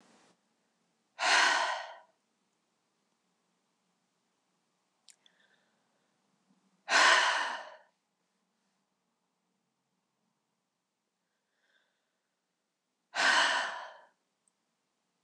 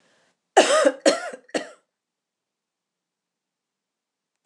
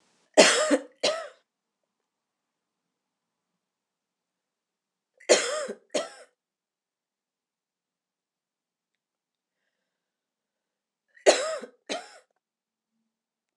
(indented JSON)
{
  "exhalation_length": "15.2 s",
  "exhalation_amplitude": 10464,
  "exhalation_signal_mean_std_ratio": 0.28,
  "cough_length": "4.5 s",
  "cough_amplitude": 25647,
  "cough_signal_mean_std_ratio": 0.27,
  "three_cough_length": "13.6 s",
  "three_cough_amplitude": 26028,
  "three_cough_signal_mean_std_ratio": 0.22,
  "survey_phase": "alpha (2021-03-01 to 2021-08-12)",
  "age": "65+",
  "gender": "Female",
  "wearing_mask": "No",
  "symptom_none": true,
  "smoker_status": "Never smoked",
  "respiratory_condition_asthma": false,
  "respiratory_condition_other": false,
  "recruitment_source": "REACT",
  "submission_delay": "2 days",
  "covid_test_result": "Negative",
  "covid_test_method": "RT-qPCR"
}